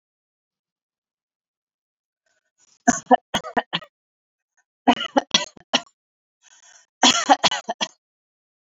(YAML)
three_cough_length: 8.7 s
three_cough_amplitude: 28088
three_cough_signal_mean_std_ratio: 0.25
survey_phase: beta (2021-08-13 to 2022-03-07)
age: 45-64
gender: Female
wearing_mask: 'No'
symptom_none: true
smoker_status: Ex-smoker
respiratory_condition_asthma: false
respiratory_condition_other: false
recruitment_source: REACT
submission_delay: 1 day
covid_test_result: Negative
covid_test_method: RT-qPCR
influenza_a_test_result: Negative
influenza_b_test_result: Negative